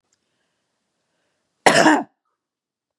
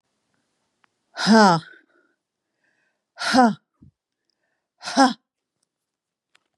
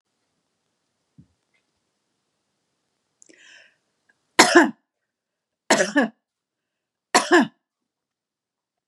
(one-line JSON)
{"cough_length": "3.0 s", "cough_amplitude": 32768, "cough_signal_mean_std_ratio": 0.26, "exhalation_length": "6.6 s", "exhalation_amplitude": 29883, "exhalation_signal_mean_std_ratio": 0.28, "three_cough_length": "8.9 s", "three_cough_amplitude": 32768, "three_cough_signal_mean_std_ratio": 0.23, "survey_phase": "beta (2021-08-13 to 2022-03-07)", "age": "45-64", "gender": "Female", "wearing_mask": "No", "symptom_none": true, "smoker_status": "Never smoked", "respiratory_condition_asthma": false, "respiratory_condition_other": false, "recruitment_source": "REACT", "submission_delay": "1 day", "covid_test_result": "Negative", "covid_test_method": "RT-qPCR", "influenza_a_test_result": "Negative", "influenza_b_test_result": "Negative"}